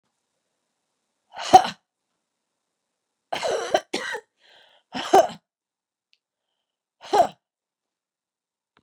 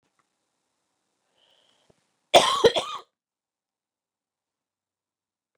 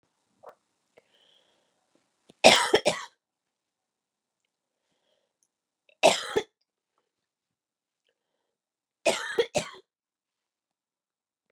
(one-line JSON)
{"exhalation_length": "8.8 s", "exhalation_amplitude": 32697, "exhalation_signal_mean_std_ratio": 0.22, "cough_length": "5.6 s", "cough_amplitude": 27309, "cough_signal_mean_std_ratio": 0.19, "three_cough_length": "11.5 s", "three_cough_amplitude": 28823, "three_cough_signal_mean_std_ratio": 0.2, "survey_phase": "beta (2021-08-13 to 2022-03-07)", "age": "45-64", "gender": "Female", "wearing_mask": "No", "symptom_cough_any": true, "symptom_runny_or_blocked_nose": true, "symptom_sore_throat": true, "symptom_fatigue": true, "symptom_headache": true, "symptom_change_to_sense_of_smell_or_taste": true, "symptom_loss_of_taste": true, "symptom_onset": "3 days", "smoker_status": "Never smoked", "respiratory_condition_asthma": false, "respiratory_condition_other": false, "recruitment_source": "Test and Trace", "submission_delay": "1 day", "covid_test_result": "Positive", "covid_test_method": "ePCR"}